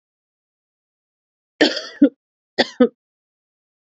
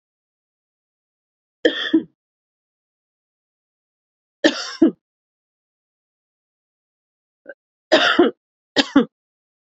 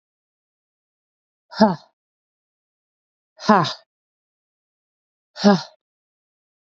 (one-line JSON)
{"cough_length": "3.8 s", "cough_amplitude": 29507, "cough_signal_mean_std_ratio": 0.23, "three_cough_length": "9.6 s", "three_cough_amplitude": 32767, "three_cough_signal_mean_std_ratio": 0.25, "exhalation_length": "6.7 s", "exhalation_amplitude": 28285, "exhalation_signal_mean_std_ratio": 0.22, "survey_phase": "beta (2021-08-13 to 2022-03-07)", "age": "18-44", "gender": "Female", "wearing_mask": "No", "symptom_cough_any": true, "symptom_runny_or_blocked_nose": true, "symptom_fatigue": true, "symptom_headache": true, "symptom_change_to_sense_of_smell_or_taste": true, "smoker_status": "Never smoked", "respiratory_condition_asthma": false, "respiratory_condition_other": false, "recruitment_source": "Test and Trace", "submission_delay": "2 days", "covid_test_result": "Positive", "covid_test_method": "LFT"}